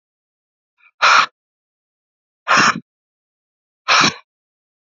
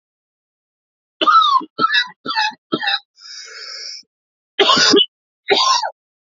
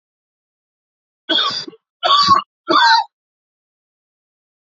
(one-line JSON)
{"exhalation_length": "4.9 s", "exhalation_amplitude": 30747, "exhalation_signal_mean_std_ratio": 0.31, "cough_length": "6.4 s", "cough_amplitude": 31326, "cough_signal_mean_std_ratio": 0.48, "three_cough_length": "4.8 s", "three_cough_amplitude": 28614, "three_cough_signal_mean_std_ratio": 0.38, "survey_phase": "alpha (2021-03-01 to 2021-08-12)", "age": "18-44", "gender": "Male", "wearing_mask": "No", "symptom_cough_any": true, "symptom_fatigue": true, "symptom_fever_high_temperature": true, "symptom_headache": true, "symptom_onset": "4 days", "smoker_status": "Never smoked", "respiratory_condition_asthma": false, "respiratory_condition_other": false, "recruitment_source": "Test and Trace", "submission_delay": "2 days", "covid_test_result": "Positive", "covid_test_method": "RT-qPCR", "covid_ct_value": 15.7, "covid_ct_gene": "ORF1ab gene", "covid_ct_mean": 15.8, "covid_viral_load": "6600000 copies/ml", "covid_viral_load_category": "High viral load (>1M copies/ml)"}